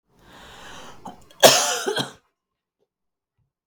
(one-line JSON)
{"cough_length": "3.7 s", "cough_amplitude": 32768, "cough_signal_mean_std_ratio": 0.28, "survey_phase": "beta (2021-08-13 to 2022-03-07)", "age": "45-64", "gender": "Female", "wearing_mask": "No", "symptom_runny_or_blocked_nose": true, "smoker_status": "Never smoked", "respiratory_condition_asthma": false, "respiratory_condition_other": false, "recruitment_source": "Test and Trace", "submission_delay": "2 days", "covid_test_result": "Negative", "covid_test_method": "RT-qPCR"}